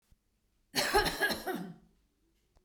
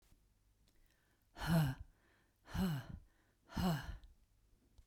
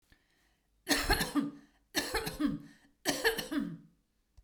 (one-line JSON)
{"cough_length": "2.6 s", "cough_amplitude": 6405, "cough_signal_mean_std_ratio": 0.44, "exhalation_length": "4.9 s", "exhalation_amplitude": 1954, "exhalation_signal_mean_std_ratio": 0.41, "three_cough_length": "4.4 s", "three_cough_amplitude": 6949, "three_cough_signal_mean_std_ratio": 0.51, "survey_phase": "beta (2021-08-13 to 2022-03-07)", "age": "45-64", "gender": "Female", "wearing_mask": "No", "symptom_none": true, "smoker_status": "Never smoked", "respiratory_condition_asthma": false, "respiratory_condition_other": false, "recruitment_source": "REACT", "submission_delay": "2 days", "covid_test_result": "Negative", "covid_test_method": "RT-qPCR"}